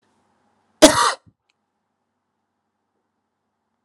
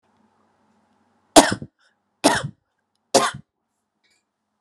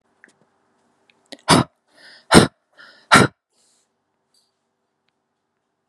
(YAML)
cough_length: 3.8 s
cough_amplitude: 32768
cough_signal_mean_std_ratio: 0.19
three_cough_length: 4.6 s
three_cough_amplitude: 32768
three_cough_signal_mean_std_ratio: 0.22
exhalation_length: 5.9 s
exhalation_amplitude: 32768
exhalation_signal_mean_std_ratio: 0.22
survey_phase: alpha (2021-03-01 to 2021-08-12)
age: 18-44
gender: Female
wearing_mask: 'No'
symptom_none: true
smoker_status: Ex-smoker
respiratory_condition_asthma: false
respiratory_condition_other: false
recruitment_source: REACT
submission_delay: 3 days
covid_test_result: Negative
covid_test_method: RT-qPCR